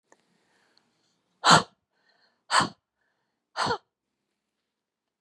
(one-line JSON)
{"exhalation_length": "5.2 s", "exhalation_amplitude": 22205, "exhalation_signal_mean_std_ratio": 0.22, "survey_phase": "beta (2021-08-13 to 2022-03-07)", "age": "45-64", "gender": "Female", "wearing_mask": "No", "symptom_none": true, "symptom_onset": "9 days", "smoker_status": "Never smoked", "respiratory_condition_asthma": true, "respiratory_condition_other": false, "recruitment_source": "REACT", "submission_delay": "3 days", "covid_test_result": "Positive", "covid_test_method": "RT-qPCR", "covid_ct_value": 30.0, "covid_ct_gene": "E gene"}